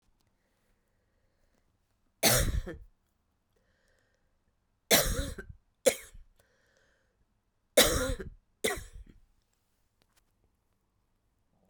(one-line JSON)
{"three_cough_length": "11.7 s", "three_cough_amplitude": 14737, "three_cough_signal_mean_std_ratio": 0.27, "survey_phase": "beta (2021-08-13 to 2022-03-07)", "age": "45-64", "gender": "Female", "wearing_mask": "No", "symptom_cough_any": true, "symptom_runny_or_blocked_nose": true, "symptom_sore_throat": true, "symptom_fatigue": true, "symptom_headache": true, "symptom_change_to_sense_of_smell_or_taste": true, "symptom_onset": "10 days", "smoker_status": "Ex-smoker", "respiratory_condition_asthma": false, "respiratory_condition_other": false, "recruitment_source": "Test and Trace", "submission_delay": "2 days", "covid_test_result": "Positive", "covid_test_method": "RT-qPCR", "covid_ct_value": 16.2, "covid_ct_gene": "ORF1ab gene", "covid_ct_mean": 16.8, "covid_viral_load": "3100000 copies/ml", "covid_viral_load_category": "High viral load (>1M copies/ml)"}